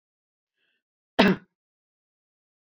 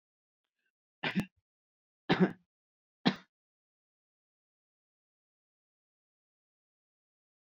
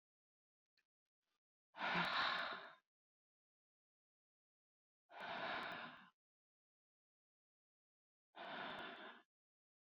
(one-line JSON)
{"cough_length": "2.7 s", "cough_amplitude": 26240, "cough_signal_mean_std_ratio": 0.19, "three_cough_length": "7.6 s", "three_cough_amplitude": 6856, "three_cough_signal_mean_std_ratio": 0.17, "exhalation_length": "10.0 s", "exhalation_amplitude": 1241, "exhalation_signal_mean_std_ratio": 0.36, "survey_phase": "beta (2021-08-13 to 2022-03-07)", "age": "65+", "gender": "Female", "wearing_mask": "No", "symptom_none": true, "smoker_status": "Ex-smoker", "respiratory_condition_asthma": false, "respiratory_condition_other": false, "recruitment_source": "REACT", "submission_delay": "5 days", "covid_test_result": "Negative", "covid_test_method": "RT-qPCR"}